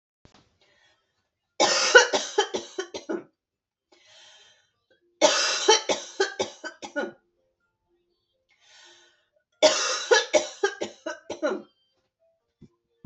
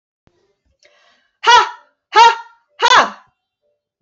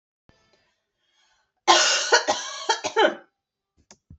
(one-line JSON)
{"three_cough_length": "13.1 s", "three_cough_amplitude": 26829, "three_cough_signal_mean_std_ratio": 0.35, "exhalation_length": "4.0 s", "exhalation_amplitude": 28166, "exhalation_signal_mean_std_ratio": 0.35, "cough_length": "4.2 s", "cough_amplitude": 23046, "cough_signal_mean_std_ratio": 0.39, "survey_phase": "beta (2021-08-13 to 2022-03-07)", "age": "18-44", "gender": "Female", "wearing_mask": "No", "symptom_runny_or_blocked_nose": true, "symptom_onset": "12 days", "smoker_status": "Never smoked", "respiratory_condition_asthma": false, "respiratory_condition_other": false, "recruitment_source": "REACT", "submission_delay": "2 days", "covid_test_result": "Negative", "covid_test_method": "RT-qPCR"}